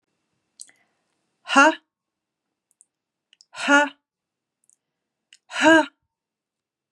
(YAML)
exhalation_length: 6.9 s
exhalation_amplitude: 30086
exhalation_signal_mean_std_ratio: 0.25
survey_phase: beta (2021-08-13 to 2022-03-07)
age: 18-44
gender: Female
wearing_mask: 'No'
symptom_none: true
smoker_status: Ex-smoker
respiratory_condition_asthma: false
respiratory_condition_other: false
recruitment_source: Test and Trace
submission_delay: 0 days
covid_test_result: Negative
covid_test_method: LFT